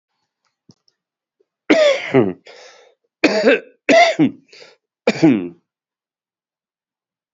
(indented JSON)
{
  "cough_length": "7.3 s",
  "cough_amplitude": 31799,
  "cough_signal_mean_std_ratio": 0.38,
  "survey_phase": "beta (2021-08-13 to 2022-03-07)",
  "age": "45-64",
  "gender": "Male",
  "wearing_mask": "No",
  "symptom_cough_any": true,
  "symptom_runny_or_blocked_nose": true,
  "symptom_sore_throat": true,
  "symptom_abdominal_pain": true,
  "symptom_fatigue": true,
  "symptom_fever_high_temperature": true,
  "symptom_headache": true,
  "symptom_change_to_sense_of_smell_or_taste": true,
  "symptom_onset": "6 days",
  "smoker_status": "Never smoked",
  "recruitment_source": "Test and Trace",
  "submission_delay": "2 days",
  "covid_test_result": "Positive",
  "covid_test_method": "RT-qPCR",
  "covid_ct_value": 16.1,
  "covid_ct_gene": "ORF1ab gene",
  "covid_ct_mean": 16.5,
  "covid_viral_load": "4000000 copies/ml",
  "covid_viral_load_category": "High viral load (>1M copies/ml)"
}